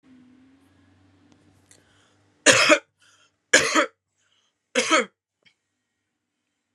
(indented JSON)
{
  "three_cough_length": "6.7 s",
  "three_cough_amplitude": 32768,
  "three_cough_signal_mean_std_ratio": 0.27,
  "survey_phase": "beta (2021-08-13 to 2022-03-07)",
  "age": "18-44",
  "gender": "Female",
  "wearing_mask": "No",
  "symptom_cough_any": true,
  "symptom_runny_or_blocked_nose": true,
  "symptom_sore_throat": true,
  "symptom_fatigue": true,
  "symptom_headache": true,
  "smoker_status": "Prefer not to say",
  "respiratory_condition_asthma": false,
  "respiratory_condition_other": false,
  "recruitment_source": "Test and Trace",
  "submission_delay": "2 days",
  "covid_test_result": "Positive",
  "covid_test_method": "RT-qPCR",
  "covid_ct_value": 29.3,
  "covid_ct_gene": "ORF1ab gene",
  "covid_ct_mean": 29.7,
  "covid_viral_load": "180 copies/ml",
  "covid_viral_load_category": "Minimal viral load (< 10K copies/ml)"
}